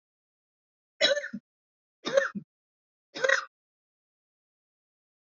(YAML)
three_cough_length: 5.2 s
three_cough_amplitude: 14260
three_cough_signal_mean_std_ratio: 0.27
survey_phase: beta (2021-08-13 to 2022-03-07)
age: 45-64
gender: Female
wearing_mask: 'No'
symptom_none: true
smoker_status: Never smoked
respiratory_condition_asthma: false
respiratory_condition_other: false
recruitment_source: REACT
submission_delay: 1 day
covid_test_result: Negative
covid_test_method: RT-qPCR
influenza_a_test_result: Negative
influenza_b_test_result: Negative